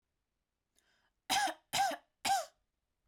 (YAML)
three_cough_length: 3.1 s
three_cough_amplitude: 3959
three_cough_signal_mean_std_ratio: 0.39
survey_phase: beta (2021-08-13 to 2022-03-07)
age: 18-44
gender: Female
wearing_mask: 'No'
symptom_none: true
smoker_status: Never smoked
respiratory_condition_asthma: false
respiratory_condition_other: false
recruitment_source: REACT
submission_delay: 6 days
covid_test_result: Negative
covid_test_method: RT-qPCR
influenza_a_test_result: Negative
influenza_b_test_result: Negative